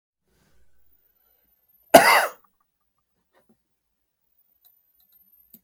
{"cough_length": "5.6 s", "cough_amplitude": 32768, "cough_signal_mean_std_ratio": 0.18, "survey_phase": "beta (2021-08-13 to 2022-03-07)", "age": "65+", "gender": "Male", "wearing_mask": "No", "symptom_none": true, "smoker_status": "Ex-smoker", "respiratory_condition_asthma": false, "respiratory_condition_other": false, "recruitment_source": "REACT", "submission_delay": "2 days", "covid_test_result": "Negative", "covid_test_method": "RT-qPCR", "influenza_a_test_result": "Negative", "influenza_b_test_result": "Negative"}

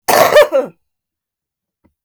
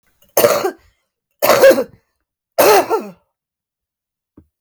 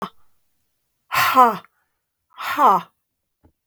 {"cough_length": "2.0 s", "cough_amplitude": 32768, "cough_signal_mean_std_ratio": 0.41, "three_cough_length": "4.6 s", "three_cough_amplitude": 32768, "three_cough_signal_mean_std_ratio": 0.4, "exhalation_length": "3.7 s", "exhalation_amplitude": 32766, "exhalation_signal_mean_std_ratio": 0.35, "survey_phase": "beta (2021-08-13 to 2022-03-07)", "age": "45-64", "gender": "Female", "wearing_mask": "No", "symptom_cough_any": true, "symptom_runny_or_blocked_nose": true, "symptom_shortness_of_breath": true, "symptom_sore_throat": true, "symptom_fatigue": true, "smoker_status": "Never smoked", "respiratory_condition_asthma": true, "respiratory_condition_other": false, "recruitment_source": "REACT", "submission_delay": "11 days", "covid_test_result": "Negative", "covid_test_method": "RT-qPCR"}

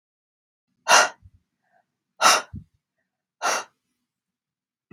{"exhalation_length": "4.9 s", "exhalation_amplitude": 31957, "exhalation_signal_mean_std_ratio": 0.26, "survey_phase": "beta (2021-08-13 to 2022-03-07)", "age": "18-44", "gender": "Female", "wearing_mask": "No", "symptom_none": true, "smoker_status": "Never smoked", "respiratory_condition_asthma": false, "respiratory_condition_other": false, "recruitment_source": "REACT", "submission_delay": "1 day", "covid_test_result": "Negative", "covid_test_method": "RT-qPCR", "influenza_a_test_result": "Negative", "influenza_b_test_result": "Negative"}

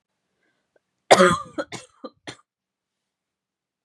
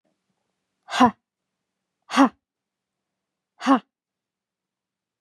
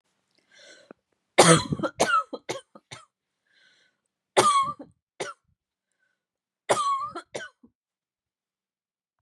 {"cough_length": "3.8 s", "cough_amplitude": 32767, "cough_signal_mean_std_ratio": 0.22, "exhalation_length": "5.2 s", "exhalation_amplitude": 27078, "exhalation_signal_mean_std_ratio": 0.21, "three_cough_length": "9.2 s", "three_cough_amplitude": 26973, "three_cough_signal_mean_std_ratio": 0.3, "survey_phase": "beta (2021-08-13 to 2022-03-07)", "age": "18-44", "gender": "Female", "wearing_mask": "No", "symptom_runny_or_blocked_nose": true, "symptom_headache": true, "symptom_onset": "6 days", "smoker_status": "Never smoked", "respiratory_condition_asthma": false, "respiratory_condition_other": false, "recruitment_source": "REACT", "submission_delay": "1 day", "covid_test_result": "Negative", "covid_test_method": "RT-qPCR", "influenza_a_test_result": "Negative", "influenza_b_test_result": "Negative"}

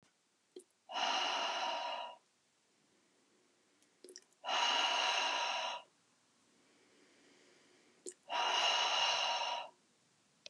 {"exhalation_length": "10.5 s", "exhalation_amplitude": 3094, "exhalation_signal_mean_std_ratio": 0.55, "survey_phase": "beta (2021-08-13 to 2022-03-07)", "age": "45-64", "gender": "Female", "wearing_mask": "No", "symptom_none": true, "symptom_onset": "12 days", "smoker_status": "Ex-smoker", "respiratory_condition_asthma": false, "respiratory_condition_other": false, "recruitment_source": "REACT", "submission_delay": "1 day", "covid_test_result": "Negative", "covid_test_method": "RT-qPCR", "influenza_a_test_result": "Negative", "influenza_b_test_result": "Negative"}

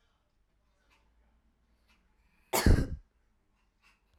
{"cough_length": "4.2 s", "cough_amplitude": 8759, "cough_signal_mean_std_ratio": 0.22, "survey_phase": "alpha (2021-03-01 to 2021-08-12)", "age": "18-44", "gender": "Female", "wearing_mask": "No", "symptom_none": true, "smoker_status": "Never smoked", "respiratory_condition_asthma": false, "respiratory_condition_other": false, "recruitment_source": "REACT", "submission_delay": "3 days", "covid_test_result": "Negative", "covid_test_method": "RT-qPCR"}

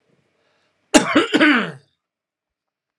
{"cough_length": "3.0 s", "cough_amplitude": 32768, "cough_signal_mean_std_ratio": 0.35, "survey_phase": "alpha (2021-03-01 to 2021-08-12)", "age": "45-64", "gender": "Male", "wearing_mask": "No", "symptom_cough_any": true, "symptom_fatigue": true, "smoker_status": "Ex-smoker", "respiratory_condition_asthma": false, "respiratory_condition_other": false, "recruitment_source": "Test and Trace", "submission_delay": "1 day", "covid_test_result": "Positive", "covid_test_method": "LFT"}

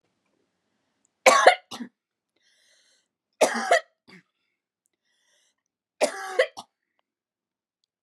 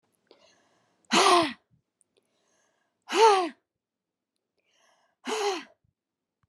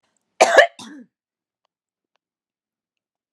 {"three_cough_length": "8.0 s", "three_cough_amplitude": 28629, "three_cough_signal_mean_std_ratio": 0.24, "exhalation_length": "6.5 s", "exhalation_amplitude": 15448, "exhalation_signal_mean_std_ratio": 0.3, "cough_length": "3.3 s", "cough_amplitude": 32768, "cough_signal_mean_std_ratio": 0.21, "survey_phase": "beta (2021-08-13 to 2022-03-07)", "age": "45-64", "gender": "Female", "wearing_mask": "No", "symptom_shortness_of_breath": true, "symptom_abdominal_pain": true, "symptom_fatigue": true, "symptom_headache": true, "symptom_onset": "12 days", "smoker_status": "Never smoked", "respiratory_condition_asthma": false, "respiratory_condition_other": false, "recruitment_source": "REACT", "submission_delay": "1 day", "covid_test_result": "Negative", "covid_test_method": "RT-qPCR"}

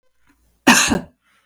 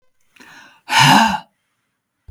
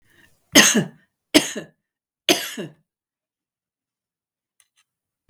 {"cough_length": "1.5 s", "cough_amplitude": 32768, "cough_signal_mean_std_ratio": 0.36, "exhalation_length": "2.3 s", "exhalation_amplitude": 32768, "exhalation_signal_mean_std_ratio": 0.38, "three_cough_length": "5.3 s", "three_cough_amplitude": 32768, "three_cough_signal_mean_std_ratio": 0.25, "survey_phase": "beta (2021-08-13 to 2022-03-07)", "age": "45-64", "gender": "Female", "wearing_mask": "No", "symptom_cough_any": true, "symptom_sore_throat": true, "symptom_fatigue": true, "symptom_headache": true, "symptom_other": true, "symptom_onset": "9 days", "smoker_status": "Never smoked", "respiratory_condition_asthma": true, "respiratory_condition_other": false, "recruitment_source": "REACT", "submission_delay": "9 days", "covid_test_result": "Positive", "covid_test_method": "RT-qPCR", "covid_ct_value": 20.0, "covid_ct_gene": "E gene", "influenza_a_test_result": "Negative", "influenza_b_test_result": "Negative"}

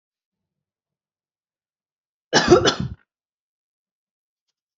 {"cough_length": "4.8 s", "cough_amplitude": 28068, "cough_signal_mean_std_ratio": 0.23, "survey_phase": "beta (2021-08-13 to 2022-03-07)", "age": "18-44", "gender": "Female", "wearing_mask": "No", "symptom_runny_or_blocked_nose": true, "smoker_status": "Never smoked", "respiratory_condition_asthma": false, "respiratory_condition_other": false, "recruitment_source": "Test and Trace", "submission_delay": "0 days", "covid_test_result": "Negative", "covid_test_method": "LFT"}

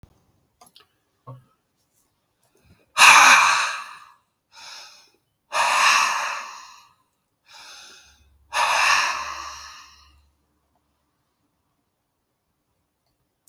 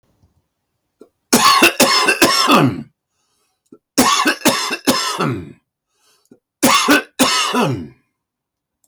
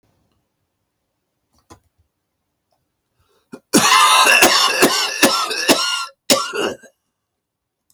{"exhalation_length": "13.5 s", "exhalation_amplitude": 32768, "exhalation_signal_mean_std_ratio": 0.32, "three_cough_length": "8.9 s", "three_cough_amplitude": 32768, "three_cough_signal_mean_std_ratio": 0.52, "cough_length": "7.9 s", "cough_amplitude": 32768, "cough_signal_mean_std_ratio": 0.45, "survey_phase": "beta (2021-08-13 to 2022-03-07)", "age": "65+", "gender": "Male", "wearing_mask": "No", "symptom_none": true, "smoker_status": "Ex-smoker", "respiratory_condition_asthma": true, "respiratory_condition_other": false, "recruitment_source": "REACT", "submission_delay": "1 day", "covid_test_result": "Negative", "covid_test_method": "RT-qPCR", "influenza_a_test_result": "Negative", "influenza_b_test_result": "Negative"}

